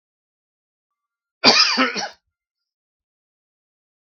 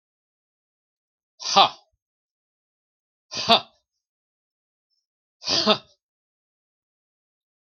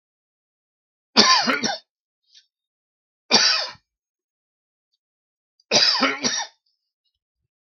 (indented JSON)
{
  "cough_length": "4.0 s",
  "cough_amplitude": 32767,
  "cough_signal_mean_std_ratio": 0.28,
  "exhalation_length": "7.8 s",
  "exhalation_amplitude": 32766,
  "exhalation_signal_mean_std_ratio": 0.21,
  "three_cough_length": "7.8 s",
  "three_cough_amplitude": 32767,
  "three_cough_signal_mean_std_ratio": 0.34,
  "survey_phase": "beta (2021-08-13 to 2022-03-07)",
  "age": "45-64",
  "gender": "Male",
  "wearing_mask": "No",
  "symptom_runny_or_blocked_nose": true,
  "symptom_onset": "12 days",
  "smoker_status": "Ex-smoker",
  "respiratory_condition_asthma": false,
  "respiratory_condition_other": false,
  "recruitment_source": "REACT",
  "submission_delay": "3 days",
  "covid_test_result": "Negative",
  "covid_test_method": "RT-qPCR",
  "influenza_a_test_result": "Negative",
  "influenza_b_test_result": "Negative"
}